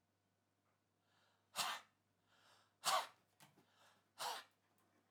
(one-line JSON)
{"exhalation_length": "5.1 s", "exhalation_amplitude": 1774, "exhalation_signal_mean_std_ratio": 0.29, "survey_phase": "alpha (2021-03-01 to 2021-08-12)", "age": "65+", "gender": "Male", "wearing_mask": "No", "symptom_none": true, "smoker_status": "Never smoked", "respiratory_condition_asthma": false, "respiratory_condition_other": false, "recruitment_source": "REACT", "submission_delay": "2 days", "covid_test_result": "Negative", "covid_test_method": "RT-qPCR"}